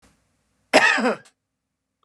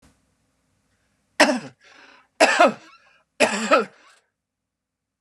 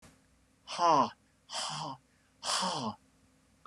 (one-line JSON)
{"cough_length": "2.0 s", "cough_amplitude": 29809, "cough_signal_mean_std_ratio": 0.35, "three_cough_length": "5.2 s", "three_cough_amplitude": 29253, "three_cough_signal_mean_std_ratio": 0.32, "exhalation_length": "3.7 s", "exhalation_amplitude": 6860, "exhalation_signal_mean_std_ratio": 0.43, "survey_phase": "beta (2021-08-13 to 2022-03-07)", "age": "45-64", "gender": "Male", "wearing_mask": "No", "symptom_none": true, "smoker_status": "Never smoked", "respiratory_condition_asthma": true, "respiratory_condition_other": false, "recruitment_source": "REACT", "submission_delay": "1 day", "covid_test_result": "Negative", "covid_test_method": "RT-qPCR"}